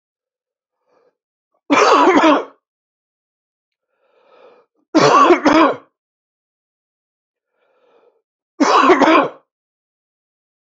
{"three_cough_length": "10.8 s", "three_cough_amplitude": 32735, "three_cough_signal_mean_std_ratio": 0.37, "survey_phase": "beta (2021-08-13 to 2022-03-07)", "age": "18-44", "gender": "Male", "wearing_mask": "No", "symptom_cough_any": true, "symptom_new_continuous_cough": true, "symptom_runny_or_blocked_nose": true, "symptom_shortness_of_breath": true, "symptom_fatigue": true, "symptom_headache": true, "symptom_onset": "4 days", "smoker_status": "Never smoked", "respiratory_condition_asthma": true, "respiratory_condition_other": false, "recruitment_source": "Test and Trace", "submission_delay": "2 days", "covid_test_result": "Positive", "covid_test_method": "ePCR"}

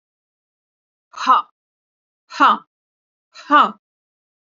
{"exhalation_length": "4.4 s", "exhalation_amplitude": 28280, "exhalation_signal_mean_std_ratio": 0.28, "survey_phase": "beta (2021-08-13 to 2022-03-07)", "age": "45-64", "gender": "Female", "wearing_mask": "No", "symptom_none": true, "smoker_status": "Never smoked", "respiratory_condition_asthma": false, "respiratory_condition_other": false, "recruitment_source": "REACT", "submission_delay": "2 days", "covid_test_result": "Negative", "covid_test_method": "RT-qPCR", "influenza_a_test_result": "Negative", "influenza_b_test_result": "Negative"}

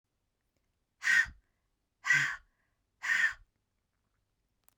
{"exhalation_length": "4.8 s", "exhalation_amplitude": 5730, "exhalation_signal_mean_std_ratio": 0.33, "survey_phase": "beta (2021-08-13 to 2022-03-07)", "age": "18-44", "gender": "Female", "wearing_mask": "No", "symptom_cough_any": true, "symptom_runny_or_blocked_nose": true, "symptom_headache": true, "symptom_change_to_sense_of_smell_or_taste": true, "symptom_loss_of_taste": true, "symptom_onset": "12 days", "smoker_status": "Never smoked", "respiratory_condition_asthma": false, "respiratory_condition_other": false, "recruitment_source": "REACT", "submission_delay": "1 day", "covid_test_result": "Negative", "covid_test_method": "RT-qPCR", "influenza_a_test_result": "Negative", "influenza_b_test_result": "Negative"}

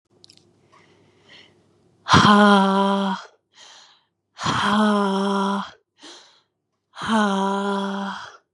{"exhalation_length": "8.5 s", "exhalation_amplitude": 30802, "exhalation_signal_mean_std_ratio": 0.51, "survey_phase": "beta (2021-08-13 to 2022-03-07)", "age": "18-44", "gender": "Female", "wearing_mask": "No", "symptom_cough_any": true, "symptom_runny_or_blocked_nose": true, "symptom_sore_throat": true, "symptom_fatigue": true, "symptom_headache": true, "smoker_status": "Never smoked", "respiratory_condition_asthma": false, "respiratory_condition_other": false, "recruitment_source": "Test and Trace", "submission_delay": "2 days", "covid_test_result": "Positive", "covid_test_method": "RT-qPCR", "covid_ct_value": 30.6, "covid_ct_gene": "N gene"}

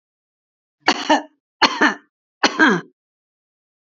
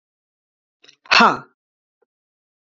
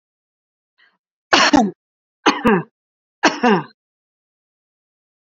{"cough_length": "3.8 s", "cough_amplitude": 30978, "cough_signal_mean_std_ratio": 0.34, "exhalation_length": "2.7 s", "exhalation_amplitude": 31038, "exhalation_signal_mean_std_ratio": 0.23, "three_cough_length": "5.2 s", "three_cough_amplitude": 30926, "three_cough_signal_mean_std_ratio": 0.33, "survey_phase": "beta (2021-08-13 to 2022-03-07)", "age": "45-64", "gender": "Female", "wearing_mask": "No", "symptom_none": true, "smoker_status": "Never smoked", "respiratory_condition_asthma": false, "respiratory_condition_other": false, "recruitment_source": "Test and Trace", "submission_delay": "0 days", "covid_test_result": "Negative", "covid_test_method": "ePCR"}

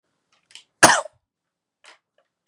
{"cough_length": "2.5 s", "cough_amplitude": 32768, "cough_signal_mean_std_ratio": 0.19, "survey_phase": "beta (2021-08-13 to 2022-03-07)", "age": "18-44", "gender": "Male", "wearing_mask": "No", "symptom_none": true, "smoker_status": "Current smoker (e-cigarettes or vapes only)", "respiratory_condition_asthma": false, "respiratory_condition_other": false, "recruitment_source": "REACT", "submission_delay": "8 days", "covid_test_result": "Negative", "covid_test_method": "RT-qPCR", "influenza_a_test_result": "Negative", "influenza_b_test_result": "Negative"}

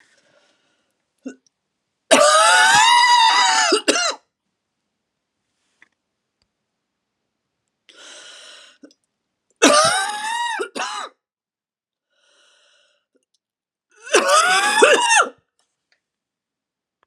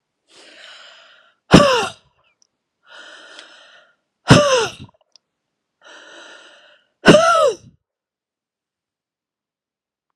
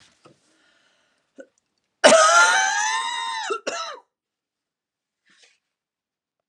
{"three_cough_length": "17.1 s", "three_cough_amplitude": 32768, "three_cough_signal_mean_std_ratio": 0.41, "exhalation_length": "10.2 s", "exhalation_amplitude": 32768, "exhalation_signal_mean_std_ratio": 0.28, "cough_length": "6.5 s", "cough_amplitude": 31700, "cough_signal_mean_std_ratio": 0.36, "survey_phase": "beta (2021-08-13 to 2022-03-07)", "age": "45-64", "gender": "Female", "wearing_mask": "No", "symptom_runny_or_blocked_nose": true, "symptom_fatigue": true, "symptom_change_to_sense_of_smell_or_taste": true, "symptom_other": true, "smoker_status": "Ex-smoker", "respiratory_condition_asthma": false, "respiratory_condition_other": false, "recruitment_source": "Test and Trace", "submission_delay": "2 days", "covid_test_result": "Positive", "covid_test_method": "RT-qPCR", "covid_ct_value": 21.6, "covid_ct_gene": "ORF1ab gene"}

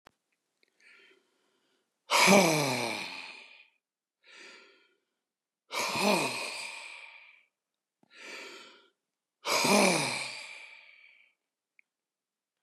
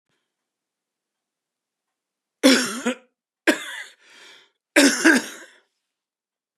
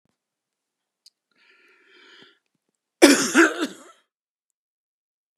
{"exhalation_length": "12.6 s", "exhalation_amplitude": 14858, "exhalation_signal_mean_std_ratio": 0.36, "three_cough_length": "6.6 s", "three_cough_amplitude": 30724, "three_cough_signal_mean_std_ratio": 0.29, "cough_length": "5.4 s", "cough_amplitude": 32768, "cough_signal_mean_std_ratio": 0.23, "survey_phase": "beta (2021-08-13 to 2022-03-07)", "age": "65+", "gender": "Male", "wearing_mask": "No", "symptom_none": true, "smoker_status": "Never smoked", "respiratory_condition_asthma": true, "respiratory_condition_other": false, "recruitment_source": "REACT", "submission_delay": "2 days", "covid_test_result": "Negative", "covid_test_method": "RT-qPCR", "influenza_a_test_result": "Negative", "influenza_b_test_result": "Negative"}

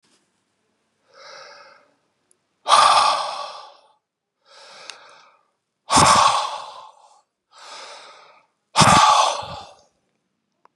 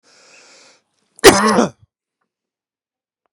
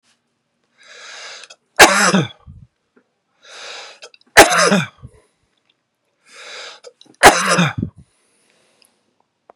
{"exhalation_length": "10.8 s", "exhalation_amplitude": 32768, "exhalation_signal_mean_std_ratio": 0.36, "cough_length": "3.3 s", "cough_amplitude": 32768, "cough_signal_mean_std_ratio": 0.26, "three_cough_length": "9.6 s", "three_cough_amplitude": 32768, "three_cough_signal_mean_std_ratio": 0.3, "survey_phase": "beta (2021-08-13 to 2022-03-07)", "age": "45-64", "gender": "Male", "wearing_mask": "No", "symptom_none": true, "smoker_status": "Current smoker (1 to 10 cigarettes per day)", "respiratory_condition_asthma": false, "respiratory_condition_other": false, "recruitment_source": "REACT", "submission_delay": "4 days", "covid_test_result": "Negative", "covid_test_method": "RT-qPCR", "influenza_a_test_result": "Negative", "influenza_b_test_result": "Negative"}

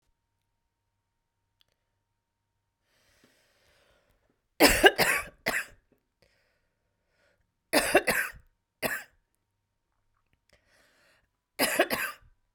{"cough_length": "12.5 s", "cough_amplitude": 23791, "cough_signal_mean_std_ratio": 0.26, "survey_phase": "beta (2021-08-13 to 2022-03-07)", "age": "45-64", "gender": "Female", "wearing_mask": "No", "symptom_runny_or_blocked_nose": true, "symptom_onset": "4 days", "smoker_status": "Never smoked", "respiratory_condition_asthma": false, "respiratory_condition_other": false, "recruitment_source": "REACT", "submission_delay": "2 days", "covid_test_result": "Negative", "covid_test_method": "RT-qPCR"}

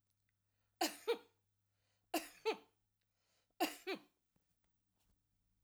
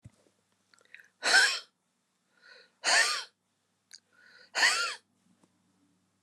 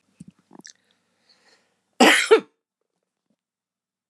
{"three_cough_length": "5.6 s", "three_cough_amplitude": 2258, "three_cough_signal_mean_std_ratio": 0.27, "exhalation_length": "6.2 s", "exhalation_amplitude": 10686, "exhalation_signal_mean_std_ratio": 0.33, "cough_length": "4.1 s", "cough_amplitude": 32346, "cough_signal_mean_std_ratio": 0.23, "survey_phase": "alpha (2021-03-01 to 2021-08-12)", "age": "65+", "gender": "Female", "wearing_mask": "No", "symptom_none": true, "smoker_status": "Never smoked", "respiratory_condition_asthma": false, "respiratory_condition_other": false, "recruitment_source": "REACT", "submission_delay": "7 days", "covid_test_result": "Negative", "covid_test_method": "RT-qPCR"}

